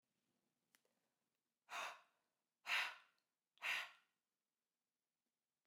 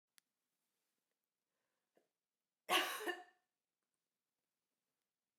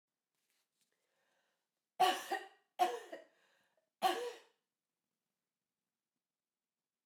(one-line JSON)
{"exhalation_length": "5.7 s", "exhalation_amplitude": 1415, "exhalation_signal_mean_std_ratio": 0.28, "cough_length": "5.4 s", "cough_amplitude": 2626, "cough_signal_mean_std_ratio": 0.21, "three_cough_length": "7.1 s", "three_cough_amplitude": 3627, "three_cough_signal_mean_std_ratio": 0.25, "survey_phase": "beta (2021-08-13 to 2022-03-07)", "age": "18-44", "gender": "Female", "wearing_mask": "No", "symptom_cough_any": true, "symptom_runny_or_blocked_nose": true, "symptom_sore_throat": true, "symptom_change_to_sense_of_smell_or_taste": true, "symptom_onset": "4 days", "smoker_status": "Never smoked", "respiratory_condition_asthma": false, "respiratory_condition_other": false, "recruitment_source": "Test and Trace", "submission_delay": "2 days", "covid_test_result": "Positive", "covid_test_method": "RT-qPCR", "covid_ct_value": 25.9, "covid_ct_gene": "ORF1ab gene", "covid_ct_mean": 26.0, "covid_viral_load": "2900 copies/ml", "covid_viral_load_category": "Minimal viral load (< 10K copies/ml)"}